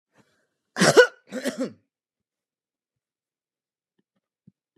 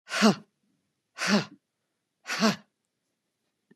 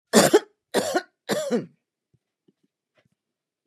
{
  "cough_length": "4.8 s",
  "cough_amplitude": 26854,
  "cough_signal_mean_std_ratio": 0.21,
  "exhalation_length": "3.8 s",
  "exhalation_amplitude": 15263,
  "exhalation_signal_mean_std_ratio": 0.32,
  "three_cough_length": "3.7 s",
  "three_cough_amplitude": 27104,
  "three_cough_signal_mean_std_ratio": 0.33,
  "survey_phase": "beta (2021-08-13 to 2022-03-07)",
  "age": "65+",
  "gender": "Female",
  "wearing_mask": "No",
  "symptom_runny_or_blocked_nose": true,
  "symptom_onset": "12 days",
  "smoker_status": "Never smoked",
  "respiratory_condition_asthma": false,
  "respiratory_condition_other": false,
  "recruitment_source": "REACT",
  "submission_delay": "1 day",
  "covid_test_result": "Negative",
  "covid_test_method": "RT-qPCR"
}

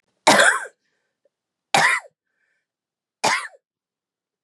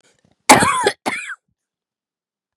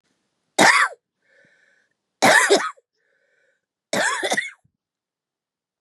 {
  "three_cough_length": "4.4 s",
  "three_cough_amplitude": 31234,
  "three_cough_signal_mean_std_ratio": 0.32,
  "exhalation_length": "2.6 s",
  "exhalation_amplitude": 32768,
  "exhalation_signal_mean_std_ratio": 0.33,
  "cough_length": "5.8 s",
  "cough_amplitude": 29166,
  "cough_signal_mean_std_ratio": 0.35,
  "survey_phase": "beta (2021-08-13 to 2022-03-07)",
  "age": "45-64",
  "gender": "Female",
  "wearing_mask": "No",
  "symptom_cough_any": true,
  "symptom_runny_or_blocked_nose": true,
  "symptom_shortness_of_breath": true,
  "symptom_sore_throat": true,
  "symptom_fatigue": true,
  "symptom_headache": true,
  "symptom_change_to_sense_of_smell_or_taste": true,
  "symptom_onset": "6 days",
  "smoker_status": "Never smoked",
  "respiratory_condition_asthma": false,
  "respiratory_condition_other": false,
  "recruitment_source": "Test and Trace",
  "submission_delay": "2 days",
  "covid_test_result": "Positive",
  "covid_test_method": "RT-qPCR",
  "covid_ct_value": 20.7,
  "covid_ct_gene": "ORF1ab gene",
  "covid_ct_mean": 21.1,
  "covid_viral_load": "120000 copies/ml",
  "covid_viral_load_category": "Low viral load (10K-1M copies/ml)"
}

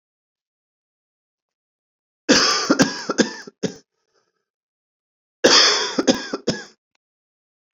{
  "cough_length": "7.8 s",
  "cough_amplitude": 31496,
  "cough_signal_mean_std_ratio": 0.35,
  "survey_phase": "beta (2021-08-13 to 2022-03-07)",
  "age": "18-44",
  "gender": "Male",
  "wearing_mask": "No",
  "symptom_cough_any": true,
  "symptom_new_continuous_cough": true,
  "symptom_runny_or_blocked_nose": true,
  "symptom_sore_throat": true,
  "symptom_onset": "4 days",
  "smoker_status": "Never smoked",
  "respiratory_condition_asthma": false,
  "respiratory_condition_other": false,
  "recruitment_source": "Test and Trace",
  "submission_delay": "1 day",
  "covid_test_result": "Negative",
  "covid_test_method": "RT-qPCR"
}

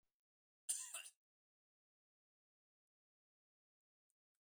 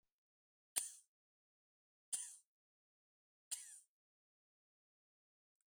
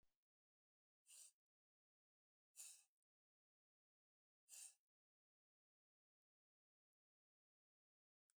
{
  "cough_length": "4.4 s",
  "cough_amplitude": 1474,
  "cough_signal_mean_std_ratio": 0.19,
  "three_cough_length": "5.7 s",
  "three_cough_amplitude": 5614,
  "three_cough_signal_mean_std_ratio": 0.2,
  "exhalation_length": "8.4 s",
  "exhalation_amplitude": 190,
  "exhalation_signal_mean_std_ratio": 0.22,
  "survey_phase": "beta (2021-08-13 to 2022-03-07)",
  "age": "65+",
  "gender": "Male",
  "wearing_mask": "No",
  "symptom_none": true,
  "smoker_status": "Ex-smoker",
  "respiratory_condition_asthma": false,
  "respiratory_condition_other": false,
  "recruitment_source": "REACT",
  "submission_delay": "2 days",
  "covid_test_result": "Negative",
  "covid_test_method": "RT-qPCR"
}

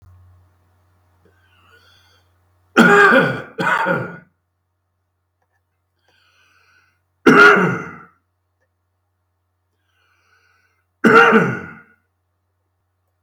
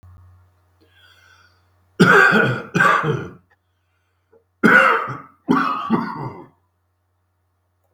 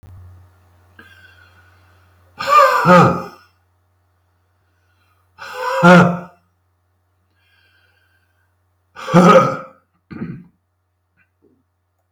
{
  "three_cough_length": "13.2 s",
  "three_cough_amplitude": 32768,
  "three_cough_signal_mean_std_ratio": 0.31,
  "cough_length": "7.9 s",
  "cough_amplitude": 32766,
  "cough_signal_mean_std_ratio": 0.42,
  "exhalation_length": "12.1 s",
  "exhalation_amplitude": 32768,
  "exhalation_signal_mean_std_ratio": 0.32,
  "survey_phase": "beta (2021-08-13 to 2022-03-07)",
  "age": "65+",
  "gender": "Male",
  "wearing_mask": "No",
  "symptom_cough_any": true,
  "symptom_fatigue": true,
  "symptom_headache": true,
  "symptom_onset": "12 days",
  "smoker_status": "Ex-smoker",
  "respiratory_condition_asthma": false,
  "respiratory_condition_other": false,
  "recruitment_source": "REACT",
  "submission_delay": "2 days",
  "covid_test_result": "Positive",
  "covid_test_method": "RT-qPCR",
  "covid_ct_value": 26.0,
  "covid_ct_gene": "E gene",
  "influenza_a_test_result": "Negative",
  "influenza_b_test_result": "Negative"
}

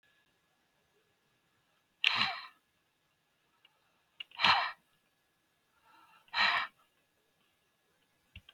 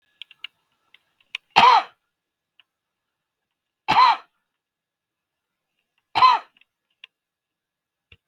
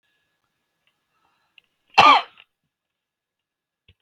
{
  "exhalation_length": "8.5 s",
  "exhalation_amplitude": 11270,
  "exhalation_signal_mean_std_ratio": 0.26,
  "three_cough_length": "8.3 s",
  "three_cough_amplitude": 32768,
  "three_cough_signal_mean_std_ratio": 0.24,
  "cough_length": "4.0 s",
  "cough_amplitude": 32768,
  "cough_signal_mean_std_ratio": 0.19,
  "survey_phase": "beta (2021-08-13 to 2022-03-07)",
  "age": "45-64",
  "gender": "Male",
  "wearing_mask": "No",
  "symptom_none": true,
  "symptom_onset": "12 days",
  "smoker_status": "Ex-smoker",
  "respiratory_condition_asthma": false,
  "respiratory_condition_other": false,
  "recruitment_source": "REACT",
  "submission_delay": "2 days",
  "covid_test_result": "Negative",
  "covid_test_method": "RT-qPCR",
  "influenza_a_test_result": "Negative",
  "influenza_b_test_result": "Negative"
}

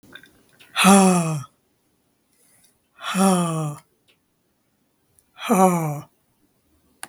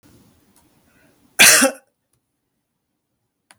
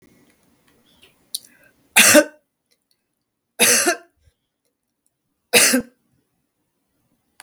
{
  "exhalation_length": "7.1 s",
  "exhalation_amplitude": 32768,
  "exhalation_signal_mean_std_ratio": 0.38,
  "cough_length": "3.6 s",
  "cough_amplitude": 32768,
  "cough_signal_mean_std_ratio": 0.24,
  "three_cough_length": "7.4 s",
  "three_cough_amplitude": 32768,
  "three_cough_signal_mean_std_ratio": 0.28,
  "survey_phase": "beta (2021-08-13 to 2022-03-07)",
  "age": "65+",
  "gender": "Female",
  "wearing_mask": "No",
  "symptom_none": true,
  "smoker_status": "Never smoked",
  "respiratory_condition_asthma": false,
  "respiratory_condition_other": false,
  "recruitment_source": "REACT",
  "submission_delay": "-1 day",
  "covid_test_result": "Negative",
  "covid_test_method": "RT-qPCR",
  "influenza_a_test_result": "Negative",
  "influenza_b_test_result": "Negative"
}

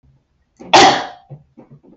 {
  "cough_length": "2.0 s",
  "cough_amplitude": 32768,
  "cough_signal_mean_std_ratio": 0.34,
  "survey_phase": "beta (2021-08-13 to 2022-03-07)",
  "age": "18-44",
  "gender": "Female",
  "wearing_mask": "No",
  "symptom_none": true,
  "smoker_status": "Never smoked",
  "respiratory_condition_asthma": false,
  "respiratory_condition_other": false,
  "recruitment_source": "REACT",
  "submission_delay": "2 days",
  "covid_test_result": "Negative",
  "covid_test_method": "RT-qPCR",
  "influenza_a_test_result": "Negative",
  "influenza_b_test_result": "Negative"
}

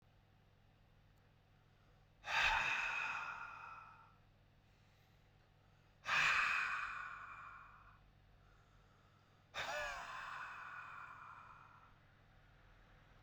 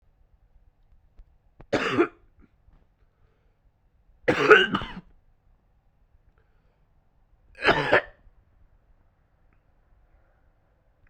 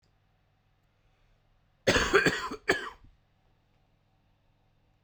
{
  "exhalation_length": "13.2 s",
  "exhalation_amplitude": 2291,
  "exhalation_signal_mean_std_ratio": 0.46,
  "three_cough_length": "11.1 s",
  "three_cough_amplitude": 32768,
  "three_cough_signal_mean_std_ratio": 0.24,
  "cough_length": "5.0 s",
  "cough_amplitude": 12680,
  "cough_signal_mean_std_ratio": 0.29,
  "survey_phase": "beta (2021-08-13 to 2022-03-07)",
  "age": "18-44",
  "gender": "Male",
  "wearing_mask": "No",
  "symptom_cough_any": true,
  "symptom_runny_or_blocked_nose": true,
  "symptom_headache": true,
  "symptom_change_to_sense_of_smell_or_taste": true,
  "symptom_loss_of_taste": true,
  "symptom_onset": "4 days",
  "smoker_status": "Never smoked",
  "respiratory_condition_asthma": true,
  "respiratory_condition_other": false,
  "recruitment_source": "Test and Trace",
  "submission_delay": "2 days",
  "covid_test_result": "Positive",
  "covid_test_method": "ePCR"
}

